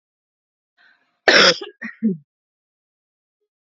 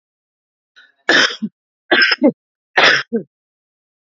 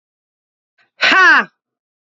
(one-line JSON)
{"cough_length": "3.7 s", "cough_amplitude": 30594, "cough_signal_mean_std_ratio": 0.27, "three_cough_length": "4.0 s", "three_cough_amplitude": 30858, "three_cough_signal_mean_std_ratio": 0.39, "exhalation_length": "2.1 s", "exhalation_amplitude": 29894, "exhalation_signal_mean_std_ratio": 0.37, "survey_phase": "alpha (2021-03-01 to 2021-08-12)", "age": "18-44", "gender": "Female", "wearing_mask": "No", "symptom_cough_any": true, "symptom_onset": "12 days", "smoker_status": "Current smoker (1 to 10 cigarettes per day)", "respiratory_condition_asthma": false, "respiratory_condition_other": false, "recruitment_source": "REACT", "submission_delay": "1 day", "covid_test_result": "Negative", "covid_test_method": "RT-qPCR"}